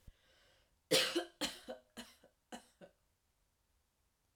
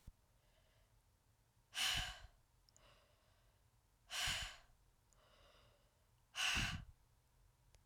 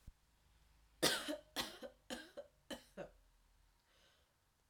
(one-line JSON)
{"three_cough_length": "4.4 s", "three_cough_amplitude": 4317, "three_cough_signal_mean_std_ratio": 0.28, "exhalation_length": "7.9 s", "exhalation_amplitude": 1377, "exhalation_signal_mean_std_ratio": 0.37, "cough_length": "4.7 s", "cough_amplitude": 4214, "cough_signal_mean_std_ratio": 0.33, "survey_phase": "alpha (2021-03-01 to 2021-08-12)", "age": "18-44", "gender": "Female", "wearing_mask": "No", "symptom_fatigue": true, "symptom_fever_high_temperature": true, "symptom_headache": true, "symptom_change_to_sense_of_smell_or_taste": true, "symptom_loss_of_taste": true, "symptom_onset": "6 days", "smoker_status": "Never smoked", "respiratory_condition_asthma": false, "respiratory_condition_other": false, "recruitment_source": "Test and Trace", "submission_delay": "2 days", "covid_test_result": "Positive", "covid_test_method": "RT-qPCR", "covid_ct_value": 18.7, "covid_ct_gene": "ORF1ab gene", "covid_ct_mean": 19.2, "covid_viral_load": "510000 copies/ml", "covid_viral_load_category": "Low viral load (10K-1M copies/ml)"}